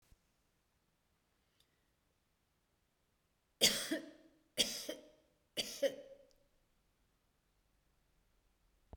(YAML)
three_cough_length: 9.0 s
three_cough_amplitude: 5717
three_cough_signal_mean_std_ratio: 0.24
survey_phase: beta (2021-08-13 to 2022-03-07)
age: 65+
gender: Female
wearing_mask: 'No'
symptom_none: true
symptom_onset: 12 days
smoker_status: Ex-smoker
respiratory_condition_asthma: false
respiratory_condition_other: false
recruitment_source: REACT
submission_delay: 1 day
covid_test_result: Negative
covid_test_method: RT-qPCR